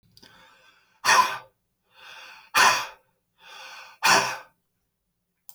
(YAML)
exhalation_length: 5.5 s
exhalation_amplitude: 21016
exhalation_signal_mean_std_ratio: 0.34
survey_phase: alpha (2021-03-01 to 2021-08-12)
age: 45-64
gender: Male
wearing_mask: 'No'
symptom_none: true
smoker_status: Current smoker (11 or more cigarettes per day)
respiratory_condition_asthma: false
respiratory_condition_other: false
recruitment_source: REACT
submission_delay: 1 day
covid_test_result: Negative
covid_test_method: RT-qPCR